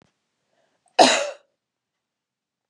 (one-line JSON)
{"cough_length": "2.7 s", "cough_amplitude": 30643, "cough_signal_mean_std_ratio": 0.23, "survey_phase": "beta (2021-08-13 to 2022-03-07)", "age": "45-64", "gender": "Female", "wearing_mask": "No", "symptom_none": true, "smoker_status": "Ex-smoker", "respiratory_condition_asthma": false, "respiratory_condition_other": false, "recruitment_source": "REACT", "submission_delay": "3 days", "covid_test_result": "Negative", "covid_test_method": "RT-qPCR", "influenza_a_test_result": "Negative", "influenza_b_test_result": "Negative"}